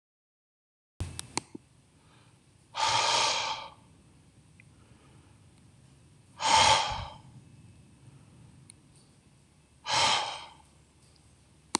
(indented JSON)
{
  "exhalation_length": "11.8 s",
  "exhalation_amplitude": 19677,
  "exhalation_signal_mean_std_ratio": 0.36,
  "survey_phase": "beta (2021-08-13 to 2022-03-07)",
  "age": "45-64",
  "gender": "Male",
  "wearing_mask": "No",
  "symptom_fatigue": true,
  "smoker_status": "Never smoked",
  "respiratory_condition_asthma": false,
  "respiratory_condition_other": false,
  "recruitment_source": "REACT",
  "submission_delay": "1 day",
  "covid_test_result": "Negative",
  "covid_test_method": "RT-qPCR",
  "influenza_a_test_result": "Unknown/Void",
  "influenza_b_test_result": "Unknown/Void"
}